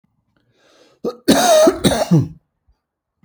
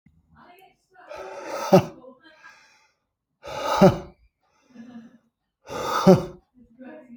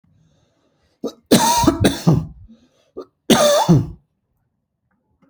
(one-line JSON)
{"cough_length": "3.2 s", "cough_amplitude": 30879, "cough_signal_mean_std_ratio": 0.45, "exhalation_length": "7.2 s", "exhalation_amplitude": 27125, "exhalation_signal_mean_std_ratio": 0.29, "three_cough_length": "5.3 s", "three_cough_amplitude": 32739, "three_cough_signal_mean_std_ratio": 0.43, "survey_phase": "alpha (2021-03-01 to 2021-08-12)", "age": "45-64", "gender": "Male", "wearing_mask": "No", "symptom_none": true, "smoker_status": "Never smoked", "respiratory_condition_asthma": true, "respiratory_condition_other": false, "recruitment_source": "REACT", "submission_delay": "1 day", "covid_test_result": "Negative", "covid_test_method": "RT-qPCR"}